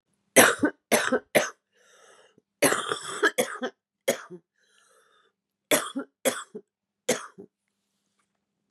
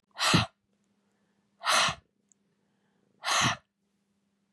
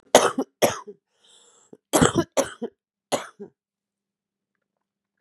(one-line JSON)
{"three_cough_length": "8.7 s", "three_cough_amplitude": 27187, "three_cough_signal_mean_std_ratio": 0.33, "exhalation_length": "4.5 s", "exhalation_amplitude": 11001, "exhalation_signal_mean_std_ratio": 0.35, "cough_length": "5.2 s", "cough_amplitude": 32768, "cough_signal_mean_std_ratio": 0.29, "survey_phase": "beta (2021-08-13 to 2022-03-07)", "age": "45-64", "gender": "Female", "wearing_mask": "No", "symptom_none": true, "smoker_status": "Current smoker (11 or more cigarettes per day)", "respiratory_condition_asthma": false, "respiratory_condition_other": false, "recruitment_source": "Test and Trace", "submission_delay": "2 days", "covid_test_result": "Positive", "covid_test_method": "LFT"}